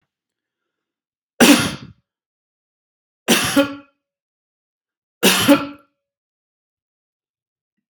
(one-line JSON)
{"three_cough_length": "7.9 s", "three_cough_amplitude": 32768, "three_cough_signal_mean_std_ratio": 0.28, "survey_phase": "beta (2021-08-13 to 2022-03-07)", "age": "65+", "gender": "Male", "wearing_mask": "No", "symptom_none": true, "symptom_onset": "12 days", "smoker_status": "Never smoked", "respiratory_condition_asthma": false, "respiratory_condition_other": false, "recruitment_source": "REACT", "submission_delay": "1 day", "covid_test_result": "Negative", "covid_test_method": "RT-qPCR"}